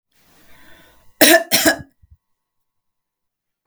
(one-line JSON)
{"cough_length": "3.7 s", "cough_amplitude": 32768, "cough_signal_mean_std_ratio": 0.28, "survey_phase": "beta (2021-08-13 to 2022-03-07)", "age": "45-64", "gender": "Female", "wearing_mask": "No", "symptom_none": true, "smoker_status": "Never smoked", "respiratory_condition_asthma": false, "respiratory_condition_other": false, "recruitment_source": "REACT", "submission_delay": "3 days", "covid_test_result": "Negative", "covid_test_method": "RT-qPCR"}